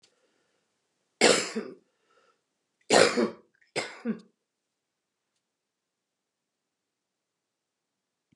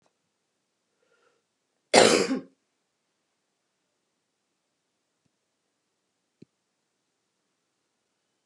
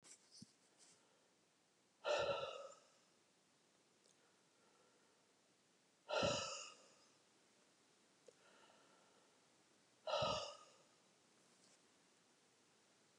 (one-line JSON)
{"three_cough_length": "8.4 s", "three_cough_amplitude": 18813, "three_cough_signal_mean_std_ratio": 0.24, "cough_length": "8.5 s", "cough_amplitude": 31889, "cough_signal_mean_std_ratio": 0.16, "exhalation_length": "13.2 s", "exhalation_amplitude": 1341, "exhalation_signal_mean_std_ratio": 0.32, "survey_phase": "beta (2021-08-13 to 2022-03-07)", "age": "65+", "gender": "Female", "wearing_mask": "No", "symptom_cough_any": true, "symptom_onset": "7 days", "smoker_status": "Ex-smoker", "respiratory_condition_asthma": false, "respiratory_condition_other": false, "recruitment_source": "REACT", "submission_delay": "3 days", "covid_test_result": "Negative", "covid_test_method": "RT-qPCR", "influenza_a_test_result": "Negative", "influenza_b_test_result": "Negative"}